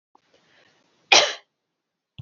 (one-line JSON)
{"cough_length": "2.2 s", "cough_amplitude": 28323, "cough_signal_mean_std_ratio": 0.22, "survey_phase": "alpha (2021-03-01 to 2021-08-12)", "age": "18-44", "gender": "Female", "wearing_mask": "No", "symptom_none": true, "smoker_status": "Never smoked", "respiratory_condition_asthma": false, "respiratory_condition_other": false, "recruitment_source": "REACT", "submission_delay": "1 day", "covid_test_result": "Negative", "covid_test_method": "RT-qPCR"}